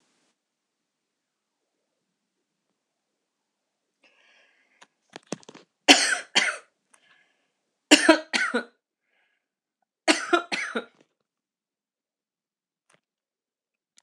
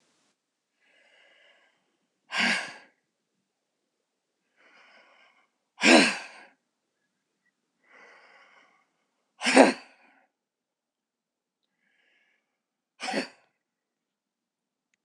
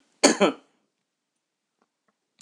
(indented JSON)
{
  "three_cough_length": "14.0 s",
  "three_cough_amplitude": 26028,
  "three_cough_signal_mean_std_ratio": 0.21,
  "exhalation_length": "15.0 s",
  "exhalation_amplitude": 26027,
  "exhalation_signal_mean_std_ratio": 0.19,
  "cough_length": "2.4 s",
  "cough_amplitude": 26027,
  "cough_signal_mean_std_ratio": 0.23,
  "survey_phase": "beta (2021-08-13 to 2022-03-07)",
  "age": "45-64",
  "gender": "Female",
  "wearing_mask": "No",
  "symptom_none": true,
  "symptom_onset": "12 days",
  "smoker_status": "Never smoked",
  "respiratory_condition_asthma": false,
  "respiratory_condition_other": false,
  "recruitment_source": "REACT",
  "submission_delay": "7 days",
  "covid_test_result": "Negative",
  "covid_test_method": "RT-qPCR"
}